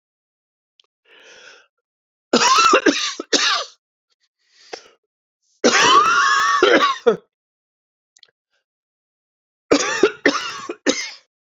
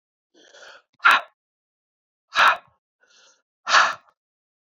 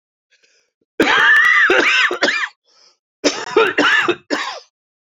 {"three_cough_length": "11.5 s", "three_cough_amplitude": 32767, "three_cough_signal_mean_std_ratio": 0.44, "exhalation_length": "4.7 s", "exhalation_amplitude": 24544, "exhalation_signal_mean_std_ratio": 0.29, "cough_length": "5.1 s", "cough_amplitude": 28727, "cough_signal_mean_std_ratio": 0.6, "survey_phase": "beta (2021-08-13 to 2022-03-07)", "age": "45-64", "gender": "Female", "wearing_mask": "No", "symptom_cough_any": true, "symptom_runny_or_blocked_nose": true, "symptom_shortness_of_breath": true, "symptom_sore_throat": true, "symptom_abdominal_pain": true, "symptom_fatigue": true, "symptom_headache": true, "symptom_change_to_sense_of_smell_or_taste": true, "symptom_loss_of_taste": true, "symptom_other": true, "symptom_onset": "5 days", "smoker_status": "Ex-smoker", "respiratory_condition_asthma": false, "respiratory_condition_other": false, "recruitment_source": "Test and Trace", "submission_delay": "1 day", "covid_test_result": "Positive", "covid_test_method": "RT-qPCR", "covid_ct_value": 19.2, "covid_ct_gene": "ORF1ab gene", "covid_ct_mean": 19.9, "covid_viral_load": "290000 copies/ml", "covid_viral_load_category": "Low viral load (10K-1M copies/ml)"}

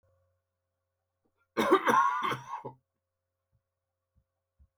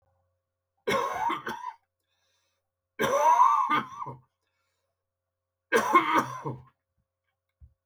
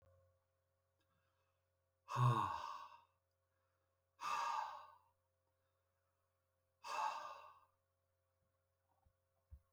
{"cough_length": "4.8 s", "cough_amplitude": 8902, "cough_signal_mean_std_ratio": 0.32, "three_cough_length": "7.9 s", "three_cough_amplitude": 12217, "three_cough_signal_mean_std_ratio": 0.42, "exhalation_length": "9.7 s", "exhalation_amplitude": 2092, "exhalation_signal_mean_std_ratio": 0.32, "survey_phase": "beta (2021-08-13 to 2022-03-07)", "age": "65+", "gender": "Male", "wearing_mask": "No", "symptom_cough_any": true, "symptom_new_continuous_cough": true, "symptom_sore_throat": true, "symptom_onset": "8 days", "smoker_status": "Ex-smoker", "respiratory_condition_asthma": false, "respiratory_condition_other": false, "recruitment_source": "Test and Trace", "submission_delay": "1 day", "covid_test_result": "Negative", "covid_test_method": "RT-qPCR"}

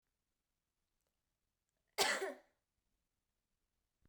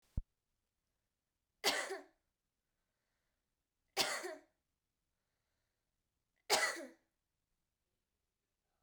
{"cough_length": "4.1 s", "cough_amplitude": 3992, "cough_signal_mean_std_ratio": 0.22, "three_cough_length": "8.8 s", "three_cough_amplitude": 5261, "three_cough_signal_mean_std_ratio": 0.25, "survey_phase": "beta (2021-08-13 to 2022-03-07)", "age": "18-44", "gender": "Female", "wearing_mask": "No", "symptom_cough_any": true, "symptom_runny_or_blocked_nose": true, "symptom_fatigue": true, "symptom_headache": true, "symptom_onset": "5 days", "smoker_status": "Never smoked", "respiratory_condition_asthma": false, "respiratory_condition_other": false, "recruitment_source": "Test and Trace", "submission_delay": "2 days", "covid_test_result": "Positive", "covid_test_method": "RT-qPCR", "covid_ct_value": 12.6, "covid_ct_gene": "ORF1ab gene"}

